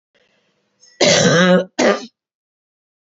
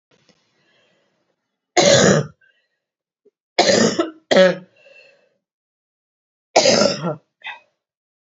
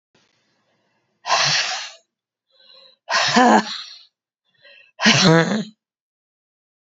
{"cough_length": "3.1 s", "cough_amplitude": 31276, "cough_signal_mean_std_ratio": 0.45, "three_cough_length": "8.4 s", "three_cough_amplitude": 30404, "three_cough_signal_mean_std_ratio": 0.36, "exhalation_length": "7.0 s", "exhalation_amplitude": 30150, "exhalation_signal_mean_std_ratio": 0.39, "survey_phase": "beta (2021-08-13 to 2022-03-07)", "age": "45-64", "gender": "Female", "wearing_mask": "No", "symptom_cough_any": true, "symptom_runny_or_blocked_nose": true, "symptom_shortness_of_breath": true, "symptom_sore_throat": true, "symptom_fatigue": true, "symptom_headache": true, "symptom_change_to_sense_of_smell_or_taste": true, "symptom_onset": "3 days", "smoker_status": "Never smoked", "respiratory_condition_asthma": false, "respiratory_condition_other": false, "recruitment_source": "Test and Trace", "submission_delay": "2 days", "covid_test_result": "Positive", "covid_test_method": "RT-qPCR", "covid_ct_value": 21.8, "covid_ct_gene": "ORF1ab gene", "covid_ct_mean": 22.4, "covid_viral_load": "44000 copies/ml", "covid_viral_load_category": "Low viral load (10K-1M copies/ml)"}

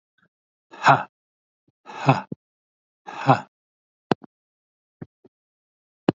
{"exhalation_length": "6.1 s", "exhalation_amplitude": 28687, "exhalation_signal_mean_std_ratio": 0.22, "survey_phase": "alpha (2021-03-01 to 2021-08-12)", "age": "45-64", "gender": "Male", "wearing_mask": "No", "symptom_none": true, "symptom_onset": "6 days", "smoker_status": "Never smoked", "respiratory_condition_asthma": false, "respiratory_condition_other": false, "recruitment_source": "REACT", "submission_delay": "1 day", "covid_test_result": "Negative", "covid_test_method": "RT-qPCR"}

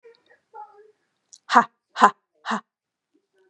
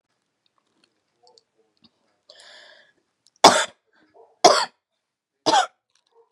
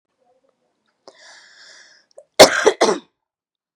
{"exhalation_length": "3.5 s", "exhalation_amplitude": 32767, "exhalation_signal_mean_std_ratio": 0.22, "three_cough_length": "6.3 s", "three_cough_amplitude": 32768, "three_cough_signal_mean_std_ratio": 0.22, "cough_length": "3.8 s", "cough_amplitude": 32768, "cough_signal_mean_std_ratio": 0.24, "survey_phase": "beta (2021-08-13 to 2022-03-07)", "age": "18-44", "gender": "Female", "wearing_mask": "No", "symptom_cough_any": true, "symptom_runny_or_blocked_nose": true, "smoker_status": "Never smoked", "respiratory_condition_asthma": true, "respiratory_condition_other": false, "recruitment_source": "Test and Trace", "submission_delay": "2 days", "covid_test_result": "Positive", "covid_test_method": "LFT"}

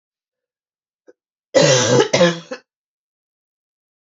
{"cough_length": "4.0 s", "cough_amplitude": 29192, "cough_signal_mean_std_ratio": 0.36, "survey_phase": "beta (2021-08-13 to 2022-03-07)", "age": "45-64", "gender": "Female", "wearing_mask": "No", "symptom_cough_any": true, "symptom_runny_or_blocked_nose": true, "symptom_fatigue": true, "smoker_status": "Never smoked", "respiratory_condition_asthma": false, "respiratory_condition_other": false, "recruitment_source": "Test and Trace", "submission_delay": "1 day", "covid_test_result": "Positive", "covid_test_method": "LFT"}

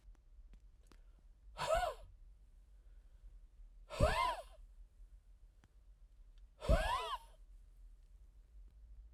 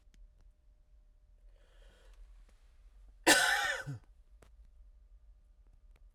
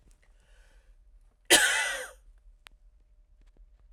{"exhalation_length": "9.1 s", "exhalation_amplitude": 4260, "exhalation_signal_mean_std_ratio": 0.4, "cough_length": "6.1 s", "cough_amplitude": 10452, "cough_signal_mean_std_ratio": 0.29, "three_cough_length": "3.9 s", "three_cough_amplitude": 21165, "three_cough_signal_mean_std_ratio": 0.29, "survey_phase": "alpha (2021-03-01 to 2021-08-12)", "age": "45-64", "gender": "Male", "wearing_mask": "No", "symptom_none": true, "smoker_status": "Ex-smoker", "respiratory_condition_asthma": false, "respiratory_condition_other": false, "recruitment_source": "REACT", "submission_delay": "1 day", "covid_test_result": "Negative", "covid_test_method": "RT-qPCR"}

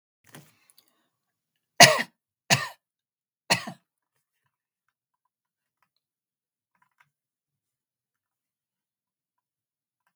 {"three_cough_length": "10.2 s", "three_cough_amplitude": 32768, "three_cough_signal_mean_std_ratio": 0.13, "survey_phase": "beta (2021-08-13 to 2022-03-07)", "age": "65+", "gender": "Female", "wearing_mask": "No", "symptom_none": true, "symptom_onset": "12 days", "smoker_status": "Never smoked", "respiratory_condition_asthma": false, "respiratory_condition_other": false, "recruitment_source": "REACT", "submission_delay": "1 day", "covid_test_result": "Negative", "covid_test_method": "RT-qPCR"}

